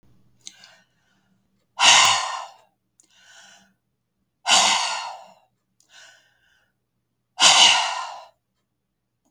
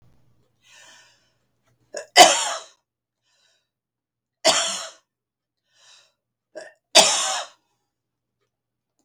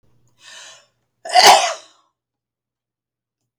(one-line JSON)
{"exhalation_length": "9.3 s", "exhalation_amplitude": 32404, "exhalation_signal_mean_std_ratio": 0.34, "three_cough_length": "9.0 s", "three_cough_amplitude": 32768, "three_cough_signal_mean_std_ratio": 0.24, "cough_length": "3.6 s", "cough_amplitude": 32768, "cough_signal_mean_std_ratio": 0.27, "survey_phase": "beta (2021-08-13 to 2022-03-07)", "age": "65+", "gender": "Female", "wearing_mask": "No", "symptom_change_to_sense_of_smell_or_taste": true, "symptom_loss_of_taste": true, "smoker_status": "Never smoked", "respiratory_condition_asthma": false, "respiratory_condition_other": false, "recruitment_source": "Test and Trace", "submission_delay": "2 days", "covid_test_result": "Positive", "covid_test_method": "RT-qPCR", "covid_ct_value": 21.3, "covid_ct_gene": "ORF1ab gene", "covid_ct_mean": 22.1, "covid_viral_load": "58000 copies/ml", "covid_viral_load_category": "Low viral load (10K-1M copies/ml)"}